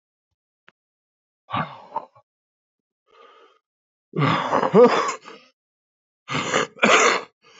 exhalation_length: 7.6 s
exhalation_amplitude: 29596
exhalation_signal_mean_std_ratio: 0.36
survey_phase: alpha (2021-03-01 to 2021-08-12)
age: 18-44
gender: Male
wearing_mask: 'No'
symptom_cough_any: true
symptom_new_continuous_cough: true
symptom_shortness_of_breath: true
symptom_abdominal_pain: true
symptom_fatigue: true
symptom_fever_high_temperature: true
symptom_headache: true
symptom_change_to_sense_of_smell_or_taste: true
symptom_loss_of_taste: true
symptom_onset: 3 days
smoker_status: Current smoker (1 to 10 cigarettes per day)
respiratory_condition_asthma: false
respiratory_condition_other: false
recruitment_source: Test and Trace
submission_delay: 2 days
covid_test_result: Positive
covid_test_method: RT-qPCR
covid_ct_value: 13.1
covid_ct_gene: ORF1ab gene
covid_ct_mean: 13.4
covid_viral_load: 41000000 copies/ml
covid_viral_load_category: High viral load (>1M copies/ml)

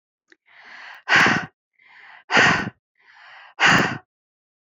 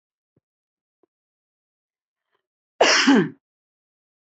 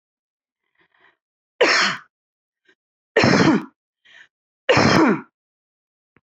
exhalation_length: 4.6 s
exhalation_amplitude: 22264
exhalation_signal_mean_std_ratio: 0.4
cough_length: 4.3 s
cough_amplitude: 22118
cough_signal_mean_std_ratio: 0.26
three_cough_length: 6.2 s
three_cough_amplitude: 25488
three_cough_signal_mean_std_ratio: 0.38
survey_phase: beta (2021-08-13 to 2022-03-07)
age: 18-44
gender: Female
wearing_mask: 'No'
symptom_cough_any: true
symptom_shortness_of_breath: true
symptom_change_to_sense_of_smell_or_taste: true
symptom_onset: 12 days
smoker_status: Never smoked
respiratory_condition_asthma: false
respiratory_condition_other: false
recruitment_source: REACT
submission_delay: 1 day
covid_test_result: Negative
covid_test_method: RT-qPCR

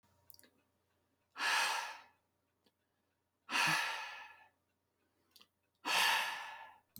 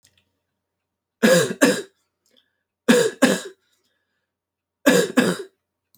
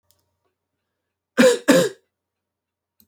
exhalation_length: 7.0 s
exhalation_amplitude: 3822
exhalation_signal_mean_std_ratio: 0.42
three_cough_length: 6.0 s
three_cough_amplitude: 29292
three_cough_signal_mean_std_ratio: 0.37
cough_length: 3.1 s
cough_amplitude: 27828
cough_signal_mean_std_ratio: 0.29
survey_phase: alpha (2021-03-01 to 2021-08-12)
age: 18-44
gender: Male
wearing_mask: 'No'
symptom_none: true
smoker_status: Never smoked
respiratory_condition_asthma: false
respiratory_condition_other: false
recruitment_source: REACT
submission_delay: 1 day
covid_test_result: Negative
covid_test_method: RT-qPCR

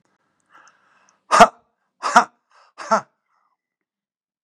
exhalation_length: 4.4 s
exhalation_amplitude: 32768
exhalation_signal_mean_std_ratio: 0.21
survey_phase: beta (2021-08-13 to 2022-03-07)
age: 65+
gender: Male
wearing_mask: 'No'
symptom_none: true
smoker_status: Ex-smoker
respiratory_condition_asthma: false
respiratory_condition_other: false
recruitment_source: REACT
submission_delay: 1 day
covid_test_result: Negative
covid_test_method: RT-qPCR
influenza_a_test_result: Negative
influenza_b_test_result: Negative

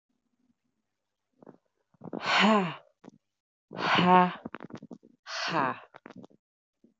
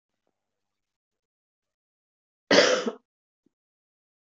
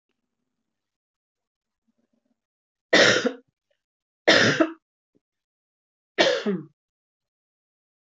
exhalation_length: 7.0 s
exhalation_amplitude: 15202
exhalation_signal_mean_std_ratio: 0.35
cough_length: 4.3 s
cough_amplitude: 21361
cough_signal_mean_std_ratio: 0.22
three_cough_length: 8.0 s
three_cough_amplitude: 22610
three_cough_signal_mean_std_ratio: 0.28
survey_phase: beta (2021-08-13 to 2022-03-07)
age: 18-44
gender: Female
wearing_mask: 'Yes'
symptom_cough_any: true
symptom_runny_or_blocked_nose: true
symptom_change_to_sense_of_smell_or_taste: true
symptom_other: true
smoker_status: Never smoked
respiratory_condition_asthma: false
respiratory_condition_other: false
recruitment_source: Test and Trace
submission_delay: 1 day
covid_test_result: Positive
covid_test_method: RT-qPCR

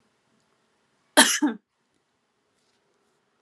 cough_length: 3.4 s
cough_amplitude: 30134
cough_signal_mean_std_ratio: 0.21
survey_phase: alpha (2021-03-01 to 2021-08-12)
age: 18-44
gender: Female
wearing_mask: 'No'
symptom_none: true
smoker_status: Never smoked
respiratory_condition_asthma: false
respiratory_condition_other: false
recruitment_source: REACT
submission_delay: 1 day
covid_test_result: Negative
covid_test_method: RT-qPCR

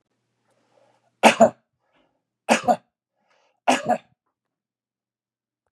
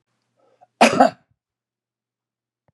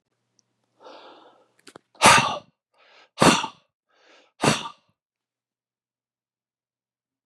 three_cough_length: 5.7 s
three_cough_amplitude: 32451
three_cough_signal_mean_std_ratio: 0.24
cough_length: 2.7 s
cough_amplitude: 30682
cough_signal_mean_std_ratio: 0.23
exhalation_length: 7.3 s
exhalation_amplitude: 30870
exhalation_signal_mean_std_ratio: 0.24
survey_phase: beta (2021-08-13 to 2022-03-07)
age: 45-64
gender: Male
wearing_mask: 'No'
symptom_none: true
smoker_status: Never smoked
respiratory_condition_asthma: false
respiratory_condition_other: false
recruitment_source: REACT
submission_delay: 4 days
covid_test_result: Negative
covid_test_method: RT-qPCR
influenza_a_test_result: Negative
influenza_b_test_result: Negative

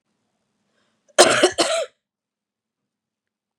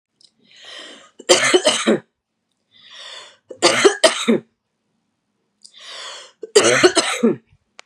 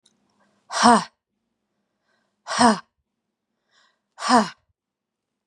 cough_length: 3.6 s
cough_amplitude: 32768
cough_signal_mean_std_ratio: 0.28
three_cough_length: 7.9 s
three_cough_amplitude: 32768
three_cough_signal_mean_std_ratio: 0.4
exhalation_length: 5.5 s
exhalation_amplitude: 29667
exhalation_signal_mean_std_ratio: 0.27
survey_phase: beta (2021-08-13 to 2022-03-07)
age: 18-44
gender: Female
wearing_mask: 'No'
symptom_cough_any: true
symptom_sore_throat: true
symptom_diarrhoea: true
symptom_fatigue: true
symptom_headache: true
symptom_onset: 4 days
smoker_status: Ex-smoker
respiratory_condition_asthma: false
respiratory_condition_other: false
recruitment_source: Test and Trace
submission_delay: 1 day
covid_test_result: Positive
covid_test_method: RT-qPCR
covid_ct_value: 17.5
covid_ct_gene: ORF1ab gene
covid_ct_mean: 17.6
covid_viral_load: 1600000 copies/ml
covid_viral_load_category: High viral load (>1M copies/ml)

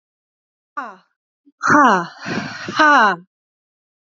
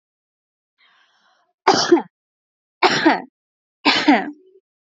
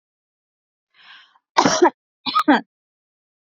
exhalation_length: 4.0 s
exhalation_amplitude: 30662
exhalation_signal_mean_std_ratio: 0.41
three_cough_length: 4.9 s
three_cough_amplitude: 29531
three_cough_signal_mean_std_ratio: 0.35
cough_length: 3.5 s
cough_amplitude: 27668
cough_signal_mean_std_ratio: 0.3
survey_phase: beta (2021-08-13 to 2022-03-07)
age: 18-44
gender: Female
wearing_mask: 'No'
symptom_none: true
smoker_status: Never smoked
respiratory_condition_asthma: false
respiratory_condition_other: false
recruitment_source: REACT
submission_delay: 1 day
covid_test_result: Negative
covid_test_method: RT-qPCR
influenza_a_test_result: Negative
influenza_b_test_result: Negative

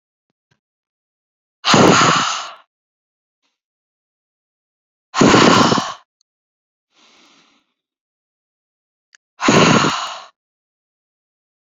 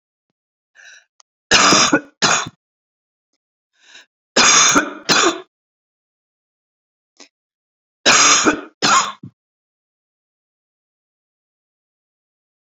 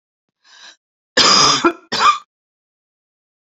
exhalation_length: 11.6 s
exhalation_amplitude: 31104
exhalation_signal_mean_std_ratio: 0.34
three_cough_length: 12.7 s
three_cough_amplitude: 32768
three_cough_signal_mean_std_ratio: 0.34
cough_length: 3.5 s
cough_amplitude: 32767
cough_signal_mean_std_ratio: 0.39
survey_phase: beta (2021-08-13 to 2022-03-07)
age: 45-64
gender: Female
wearing_mask: 'No'
symptom_runny_or_blocked_nose: true
smoker_status: Never smoked
respiratory_condition_asthma: false
respiratory_condition_other: false
recruitment_source: REACT
submission_delay: 1 day
covid_test_result: Negative
covid_test_method: RT-qPCR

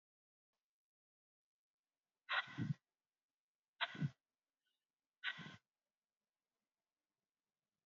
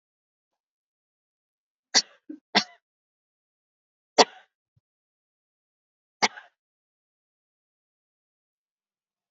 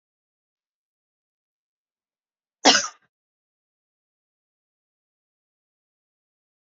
exhalation_length: 7.9 s
exhalation_amplitude: 1813
exhalation_signal_mean_std_ratio: 0.23
three_cough_length: 9.3 s
three_cough_amplitude: 29863
three_cough_signal_mean_std_ratio: 0.12
cough_length: 6.7 s
cough_amplitude: 28668
cough_signal_mean_std_ratio: 0.12
survey_phase: beta (2021-08-13 to 2022-03-07)
age: 18-44
gender: Female
wearing_mask: 'No'
symptom_cough_any: true
symptom_runny_or_blocked_nose: true
symptom_sore_throat: true
symptom_fatigue: true
smoker_status: Never smoked
respiratory_condition_asthma: false
respiratory_condition_other: false
recruitment_source: Test and Trace
submission_delay: 2 days
covid_test_result: Positive
covid_test_method: RT-qPCR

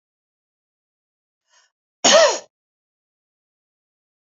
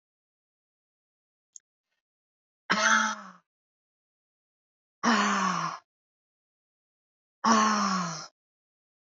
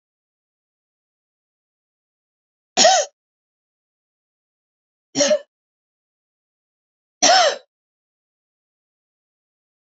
cough_length: 4.3 s
cough_amplitude: 29012
cough_signal_mean_std_ratio: 0.22
exhalation_length: 9.0 s
exhalation_amplitude: 13591
exhalation_signal_mean_std_ratio: 0.37
three_cough_length: 9.8 s
three_cough_amplitude: 32767
three_cough_signal_mean_std_ratio: 0.23
survey_phase: alpha (2021-03-01 to 2021-08-12)
age: 45-64
gender: Female
wearing_mask: 'No'
symptom_none: true
smoker_status: Ex-smoker
respiratory_condition_asthma: false
respiratory_condition_other: false
recruitment_source: REACT
submission_delay: 3 days
covid_test_result: Negative
covid_test_method: RT-qPCR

